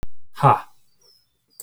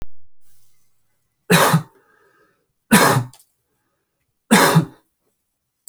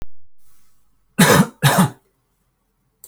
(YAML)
exhalation_length: 1.6 s
exhalation_amplitude: 24197
exhalation_signal_mean_std_ratio: 0.43
three_cough_length: 5.9 s
three_cough_amplitude: 32767
three_cough_signal_mean_std_ratio: 0.37
cough_length: 3.1 s
cough_amplitude: 32768
cough_signal_mean_std_ratio: 0.41
survey_phase: alpha (2021-03-01 to 2021-08-12)
age: 18-44
gender: Male
wearing_mask: 'No'
symptom_none: true
smoker_status: Never smoked
respiratory_condition_asthma: false
respiratory_condition_other: false
recruitment_source: REACT
submission_delay: 1 day
covid_test_result: Negative
covid_test_method: RT-qPCR